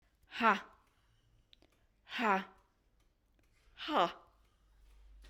{"exhalation_length": "5.3 s", "exhalation_amplitude": 6356, "exhalation_signal_mean_std_ratio": 0.3, "survey_phase": "beta (2021-08-13 to 2022-03-07)", "age": "45-64", "gender": "Female", "wearing_mask": "No", "symptom_sore_throat": true, "smoker_status": "Never smoked", "respiratory_condition_asthma": false, "respiratory_condition_other": false, "recruitment_source": "REACT", "submission_delay": "3 days", "covid_test_result": "Negative", "covid_test_method": "RT-qPCR"}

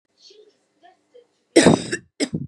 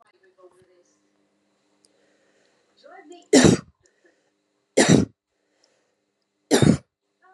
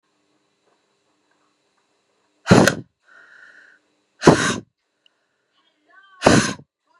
{"cough_length": "2.5 s", "cough_amplitude": 31662, "cough_signal_mean_std_ratio": 0.3, "three_cough_length": "7.3 s", "three_cough_amplitude": 31305, "three_cough_signal_mean_std_ratio": 0.25, "exhalation_length": "7.0 s", "exhalation_amplitude": 32768, "exhalation_signal_mean_std_ratio": 0.25, "survey_phase": "beta (2021-08-13 to 2022-03-07)", "age": "18-44", "gender": "Female", "wearing_mask": "No", "symptom_cough_any": true, "symptom_runny_or_blocked_nose": true, "symptom_loss_of_taste": true, "symptom_onset": "5 days", "smoker_status": "Current smoker (e-cigarettes or vapes only)", "respiratory_condition_asthma": false, "respiratory_condition_other": false, "recruitment_source": "Test and Trace", "submission_delay": "1 day", "covid_test_result": "Positive", "covid_test_method": "ePCR"}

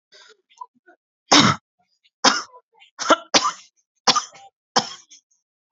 {"three_cough_length": "5.7 s", "three_cough_amplitude": 32768, "three_cough_signal_mean_std_ratio": 0.3, "survey_phase": "beta (2021-08-13 to 2022-03-07)", "age": "18-44", "gender": "Female", "wearing_mask": "No", "symptom_shortness_of_breath": true, "symptom_diarrhoea": true, "symptom_headache": true, "symptom_onset": "13 days", "smoker_status": "Current smoker (1 to 10 cigarettes per day)", "respiratory_condition_asthma": false, "respiratory_condition_other": false, "recruitment_source": "REACT", "submission_delay": "2 days", "covid_test_result": "Negative", "covid_test_method": "RT-qPCR"}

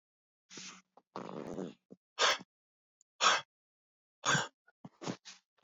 {"exhalation_length": "5.6 s", "exhalation_amplitude": 5928, "exhalation_signal_mean_std_ratio": 0.32, "survey_phase": "beta (2021-08-13 to 2022-03-07)", "age": "18-44", "gender": "Male", "wearing_mask": "No", "symptom_none": true, "smoker_status": "Ex-smoker", "respiratory_condition_asthma": true, "respiratory_condition_other": false, "recruitment_source": "REACT", "submission_delay": "5 days", "covid_test_result": "Negative", "covid_test_method": "RT-qPCR", "influenza_a_test_result": "Negative", "influenza_b_test_result": "Negative"}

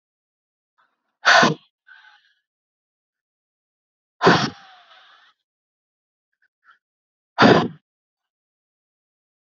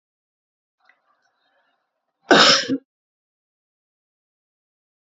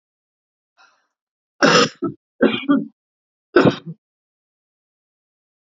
{"exhalation_length": "9.6 s", "exhalation_amplitude": 28030, "exhalation_signal_mean_std_ratio": 0.23, "cough_length": "5.0 s", "cough_amplitude": 29517, "cough_signal_mean_std_ratio": 0.22, "three_cough_length": "5.7 s", "three_cough_amplitude": 32484, "three_cough_signal_mean_std_ratio": 0.3, "survey_phase": "alpha (2021-03-01 to 2021-08-12)", "age": "45-64", "gender": "Female", "wearing_mask": "No", "symptom_cough_any": true, "smoker_status": "Never smoked", "respiratory_condition_asthma": true, "respiratory_condition_other": false, "recruitment_source": "REACT", "submission_delay": "2 days", "covid_test_result": "Negative", "covid_test_method": "RT-qPCR"}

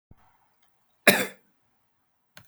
{"cough_length": "2.5 s", "cough_amplitude": 30329, "cough_signal_mean_std_ratio": 0.19, "survey_phase": "beta (2021-08-13 to 2022-03-07)", "age": "45-64", "gender": "Male", "wearing_mask": "No", "symptom_none": true, "smoker_status": "Never smoked", "respiratory_condition_asthma": false, "respiratory_condition_other": false, "recruitment_source": "REACT", "submission_delay": "25 days", "covid_test_result": "Negative", "covid_test_method": "RT-qPCR"}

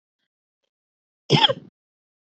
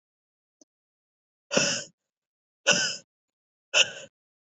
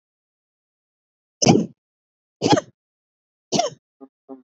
{"cough_length": "2.2 s", "cough_amplitude": 25091, "cough_signal_mean_std_ratio": 0.24, "exhalation_length": "4.4 s", "exhalation_amplitude": 15829, "exhalation_signal_mean_std_ratio": 0.3, "three_cough_length": "4.5 s", "three_cough_amplitude": 29745, "three_cough_signal_mean_std_ratio": 0.27, "survey_phase": "beta (2021-08-13 to 2022-03-07)", "age": "18-44", "gender": "Female", "wearing_mask": "No", "symptom_sore_throat": true, "symptom_fatigue": true, "symptom_fever_high_temperature": true, "smoker_status": "Never smoked", "respiratory_condition_asthma": false, "respiratory_condition_other": false, "recruitment_source": "Test and Trace", "submission_delay": "2 days", "covid_test_result": "Positive", "covid_test_method": "RT-qPCR", "covid_ct_value": 20.1, "covid_ct_gene": "ORF1ab gene"}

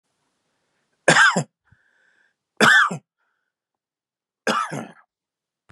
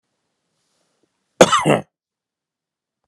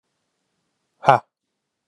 {"three_cough_length": "5.7 s", "three_cough_amplitude": 31564, "three_cough_signal_mean_std_ratio": 0.31, "cough_length": "3.1 s", "cough_amplitude": 32768, "cough_signal_mean_std_ratio": 0.23, "exhalation_length": "1.9 s", "exhalation_amplitude": 32768, "exhalation_signal_mean_std_ratio": 0.16, "survey_phase": "beta (2021-08-13 to 2022-03-07)", "age": "45-64", "gender": "Male", "wearing_mask": "No", "symptom_none": true, "smoker_status": "Ex-smoker", "respiratory_condition_asthma": false, "respiratory_condition_other": false, "recruitment_source": "REACT", "submission_delay": "1 day", "covid_test_result": "Negative", "covid_test_method": "RT-qPCR", "influenza_a_test_result": "Unknown/Void", "influenza_b_test_result": "Unknown/Void"}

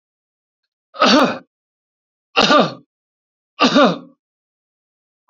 {"three_cough_length": "5.3 s", "three_cough_amplitude": 30809, "three_cough_signal_mean_std_ratio": 0.35, "survey_phase": "beta (2021-08-13 to 2022-03-07)", "age": "45-64", "gender": "Male", "wearing_mask": "No", "symptom_none": true, "smoker_status": "Never smoked", "respiratory_condition_asthma": false, "respiratory_condition_other": false, "recruitment_source": "REACT", "submission_delay": "1 day", "covid_test_result": "Negative", "covid_test_method": "RT-qPCR"}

